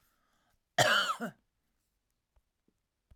{
  "cough_length": "3.2 s",
  "cough_amplitude": 8071,
  "cough_signal_mean_std_ratio": 0.29,
  "survey_phase": "alpha (2021-03-01 to 2021-08-12)",
  "age": "45-64",
  "gender": "Female",
  "wearing_mask": "No",
  "symptom_none": true,
  "smoker_status": "Ex-smoker",
  "respiratory_condition_asthma": false,
  "respiratory_condition_other": false,
  "recruitment_source": "REACT",
  "submission_delay": "2 days",
  "covid_test_result": "Negative",
  "covid_test_method": "RT-qPCR"
}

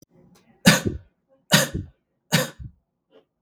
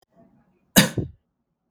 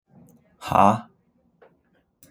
{
  "three_cough_length": "3.4 s",
  "three_cough_amplitude": 32768,
  "three_cough_signal_mean_std_ratio": 0.31,
  "cough_length": "1.7 s",
  "cough_amplitude": 32766,
  "cough_signal_mean_std_ratio": 0.24,
  "exhalation_length": "2.3 s",
  "exhalation_amplitude": 25460,
  "exhalation_signal_mean_std_ratio": 0.26,
  "survey_phase": "beta (2021-08-13 to 2022-03-07)",
  "age": "18-44",
  "gender": "Male",
  "wearing_mask": "No",
  "symptom_sore_throat": true,
  "smoker_status": "Never smoked",
  "recruitment_source": "REACT",
  "submission_delay": "3 days",
  "covid_test_result": "Positive",
  "covid_test_method": "RT-qPCR",
  "covid_ct_value": 27.0,
  "covid_ct_gene": "E gene",
  "influenza_a_test_result": "Negative",
  "influenza_b_test_result": "Negative"
}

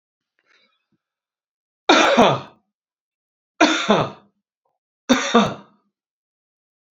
{
  "three_cough_length": "7.0 s",
  "three_cough_amplitude": 32767,
  "three_cough_signal_mean_std_ratio": 0.33,
  "survey_phase": "beta (2021-08-13 to 2022-03-07)",
  "age": "65+",
  "gender": "Male",
  "wearing_mask": "No",
  "symptom_cough_any": true,
  "smoker_status": "Ex-smoker",
  "respiratory_condition_asthma": false,
  "respiratory_condition_other": false,
  "recruitment_source": "REACT",
  "submission_delay": "1 day",
  "covid_test_result": "Negative",
  "covid_test_method": "RT-qPCR"
}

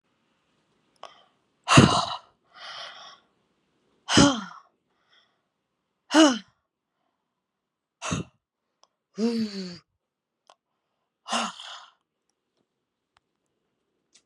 {
  "exhalation_length": "14.3 s",
  "exhalation_amplitude": 27698,
  "exhalation_signal_mean_std_ratio": 0.25,
  "survey_phase": "beta (2021-08-13 to 2022-03-07)",
  "age": "18-44",
  "gender": "Female",
  "wearing_mask": "No",
  "symptom_runny_or_blocked_nose": true,
  "symptom_fatigue": true,
  "smoker_status": "Never smoked",
  "respiratory_condition_asthma": false,
  "respiratory_condition_other": false,
  "recruitment_source": "Test and Trace",
  "submission_delay": "1 day",
  "covid_test_result": "Positive",
  "covid_test_method": "RT-qPCR",
  "covid_ct_value": 17.0,
  "covid_ct_gene": "ORF1ab gene",
  "covid_ct_mean": 17.2,
  "covid_viral_load": "2200000 copies/ml",
  "covid_viral_load_category": "High viral load (>1M copies/ml)"
}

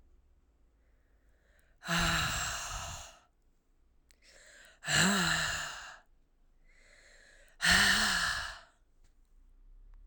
{
  "exhalation_length": "10.1 s",
  "exhalation_amplitude": 7662,
  "exhalation_signal_mean_std_ratio": 0.44,
  "survey_phase": "alpha (2021-03-01 to 2021-08-12)",
  "age": "18-44",
  "gender": "Female",
  "wearing_mask": "No",
  "symptom_cough_any": true,
  "symptom_fatigue": true,
  "symptom_headache": true,
  "symptom_onset": "5 days",
  "smoker_status": "Current smoker (e-cigarettes or vapes only)",
  "respiratory_condition_asthma": false,
  "respiratory_condition_other": false,
  "recruitment_source": "Test and Trace",
  "submission_delay": "2 days",
  "covid_test_result": "Positive",
  "covid_test_method": "ePCR"
}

